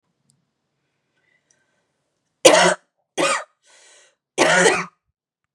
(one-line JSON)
{"three_cough_length": "5.5 s", "three_cough_amplitude": 32768, "three_cough_signal_mean_std_ratio": 0.32, "survey_phase": "beta (2021-08-13 to 2022-03-07)", "age": "18-44", "gender": "Female", "wearing_mask": "No", "symptom_none": true, "smoker_status": "Never smoked", "respiratory_condition_asthma": false, "respiratory_condition_other": false, "recruitment_source": "REACT", "submission_delay": "2 days", "covid_test_result": "Negative", "covid_test_method": "RT-qPCR", "influenza_a_test_result": "Unknown/Void", "influenza_b_test_result": "Unknown/Void"}